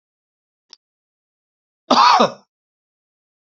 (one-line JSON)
{"cough_length": "3.5 s", "cough_amplitude": 29411, "cough_signal_mean_std_ratio": 0.27, "survey_phase": "beta (2021-08-13 to 2022-03-07)", "age": "65+", "gender": "Male", "wearing_mask": "No", "symptom_cough_any": true, "symptom_headache": true, "smoker_status": "Ex-smoker", "respiratory_condition_asthma": false, "respiratory_condition_other": false, "recruitment_source": "REACT", "submission_delay": "1 day", "covid_test_result": "Negative", "covid_test_method": "RT-qPCR", "influenza_a_test_result": "Negative", "influenza_b_test_result": "Negative"}